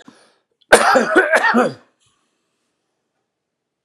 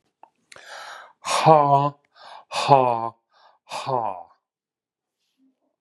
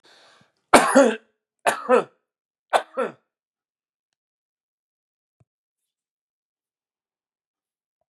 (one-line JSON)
{"cough_length": "3.8 s", "cough_amplitude": 32768, "cough_signal_mean_std_ratio": 0.39, "exhalation_length": "5.8 s", "exhalation_amplitude": 31997, "exhalation_signal_mean_std_ratio": 0.36, "three_cough_length": "8.1 s", "three_cough_amplitude": 32768, "three_cough_signal_mean_std_ratio": 0.23, "survey_phase": "beta (2021-08-13 to 2022-03-07)", "age": "45-64", "gender": "Male", "wearing_mask": "No", "symptom_none": true, "smoker_status": "Ex-smoker", "respiratory_condition_asthma": false, "respiratory_condition_other": false, "recruitment_source": "REACT", "submission_delay": "1 day", "covid_test_result": "Negative", "covid_test_method": "RT-qPCR"}